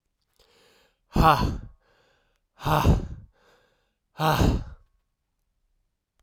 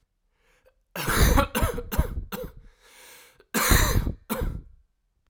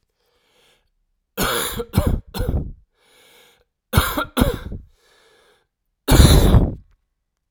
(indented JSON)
{
  "exhalation_length": "6.2 s",
  "exhalation_amplitude": 20014,
  "exhalation_signal_mean_std_ratio": 0.36,
  "cough_length": "5.3 s",
  "cough_amplitude": 21443,
  "cough_signal_mean_std_ratio": 0.49,
  "three_cough_length": "7.5 s",
  "three_cough_amplitude": 32768,
  "three_cough_signal_mean_std_ratio": 0.38,
  "survey_phase": "alpha (2021-03-01 to 2021-08-12)",
  "age": "18-44",
  "gender": "Male",
  "wearing_mask": "No",
  "symptom_cough_any": true,
  "symptom_abdominal_pain": true,
  "symptom_fatigue": true,
  "symptom_change_to_sense_of_smell_or_taste": true,
  "symptom_loss_of_taste": true,
  "symptom_onset": "7 days",
  "smoker_status": "Ex-smoker",
  "respiratory_condition_asthma": false,
  "respiratory_condition_other": false,
  "recruitment_source": "Test and Trace",
  "submission_delay": "2 days",
  "covid_test_result": "Positive",
  "covid_test_method": "RT-qPCR"
}